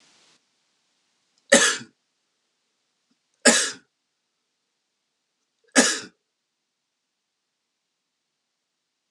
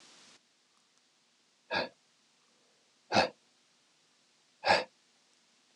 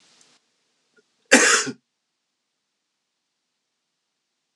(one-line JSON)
{"three_cough_length": "9.1 s", "three_cough_amplitude": 30566, "three_cough_signal_mean_std_ratio": 0.2, "exhalation_length": "5.8 s", "exhalation_amplitude": 8778, "exhalation_signal_mean_std_ratio": 0.24, "cough_length": "4.6 s", "cough_amplitude": 32535, "cough_signal_mean_std_ratio": 0.21, "survey_phase": "beta (2021-08-13 to 2022-03-07)", "age": "45-64", "gender": "Male", "wearing_mask": "No", "symptom_cough_any": true, "symptom_runny_or_blocked_nose": true, "symptom_shortness_of_breath": true, "symptom_sore_throat": true, "symptom_fatigue": true, "symptom_headache": true, "symptom_change_to_sense_of_smell_or_taste": true, "symptom_loss_of_taste": true, "smoker_status": "Ex-smoker", "respiratory_condition_asthma": false, "respiratory_condition_other": false, "recruitment_source": "Test and Trace", "submission_delay": "2 days", "covid_test_result": "Positive", "covid_test_method": "ePCR"}